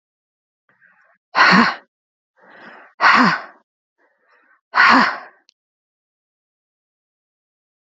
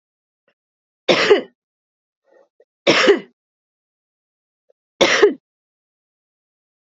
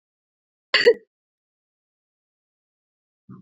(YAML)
exhalation_length: 7.9 s
exhalation_amplitude: 32748
exhalation_signal_mean_std_ratio: 0.31
three_cough_length: 6.8 s
three_cough_amplitude: 31106
three_cough_signal_mean_std_ratio: 0.29
cough_length: 3.4 s
cough_amplitude: 24966
cough_signal_mean_std_ratio: 0.18
survey_phase: beta (2021-08-13 to 2022-03-07)
age: 45-64
gender: Female
wearing_mask: 'Yes'
symptom_cough_any: true
symptom_onset: 6 days
smoker_status: Never smoked
respiratory_condition_asthma: true
respiratory_condition_other: false
recruitment_source: REACT
submission_delay: 2 days
covid_test_result: Positive
covid_test_method: RT-qPCR
covid_ct_value: 18.5
covid_ct_gene: E gene
influenza_a_test_result: Negative
influenza_b_test_result: Negative